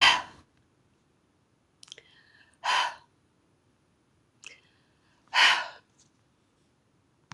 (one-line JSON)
{"exhalation_length": "7.3 s", "exhalation_amplitude": 16108, "exhalation_signal_mean_std_ratio": 0.26, "survey_phase": "beta (2021-08-13 to 2022-03-07)", "age": "65+", "gender": "Female", "wearing_mask": "No", "symptom_runny_or_blocked_nose": true, "symptom_fatigue": true, "smoker_status": "Ex-smoker", "respiratory_condition_asthma": false, "respiratory_condition_other": true, "recruitment_source": "REACT", "submission_delay": "1 day", "covid_test_result": "Negative", "covid_test_method": "RT-qPCR"}